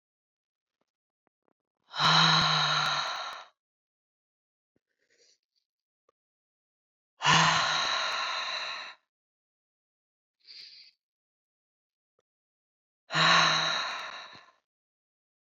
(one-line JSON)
{"exhalation_length": "15.5 s", "exhalation_amplitude": 10937, "exhalation_signal_mean_std_ratio": 0.38, "survey_phase": "beta (2021-08-13 to 2022-03-07)", "age": "45-64", "gender": "Female", "wearing_mask": "No", "symptom_cough_any": true, "symptom_runny_or_blocked_nose": true, "symptom_sore_throat": true, "symptom_fatigue": true, "symptom_other": true, "symptom_onset": "3 days", "smoker_status": "Never smoked", "respiratory_condition_asthma": false, "respiratory_condition_other": false, "recruitment_source": "Test and Trace", "submission_delay": "2 days", "covid_test_result": "Positive", "covid_test_method": "RT-qPCR", "covid_ct_value": 15.7, "covid_ct_gene": "ORF1ab gene", "covid_ct_mean": 16.0, "covid_viral_load": "5600000 copies/ml", "covid_viral_load_category": "High viral load (>1M copies/ml)"}